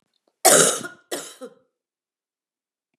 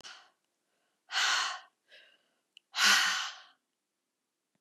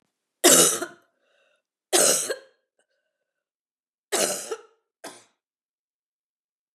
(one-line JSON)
{"cough_length": "3.0 s", "cough_amplitude": 30834, "cough_signal_mean_std_ratio": 0.29, "exhalation_length": "4.6 s", "exhalation_amplitude": 8652, "exhalation_signal_mean_std_ratio": 0.37, "three_cough_length": "6.7 s", "three_cough_amplitude": 29267, "three_cough_signal_mean_std_ratio": 0.3, "survey_phase": "beta (2021-08-13 to 2022-03-07)", "age": "65+", "gender": "Female", "wearing_mask": "No", "symptom_cough_any": true, "symptom_runny_or_blocked_nose": true, "symptom_sore_throat": true, "symptom_fatigue": true, "symptom_onset": "5 days", "smoker_status": "Never smoked", "respiratory_condition_asthma": false, "respiratory_condition_other": false, "recruitment_source": "Test and Trace", "submission_delay": "2 days", "covid_test_result": "Positive", "covid_test_method": "RT-qPCR"}